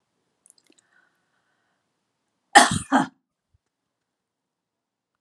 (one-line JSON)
{"cough_length": "5.2 s", "cough_amplitude": 32767, "cough_signal_mean_std_ratio": 0.18, "survey_phase": "beta (2021-08-13 to 2022-03-07)", "age": "65+", "gender": "Female", "wearing_mask": "No", "symptom_none": true, "smoker_status": "Never smoked", "respiratory_condition_asthma": false, "respiratory_condition_other": false, "recruitment_source": "REACT", "submission_delay": "2 days", "covid_test_result": "Negative", "covid_test_method": "RT-qPCR"}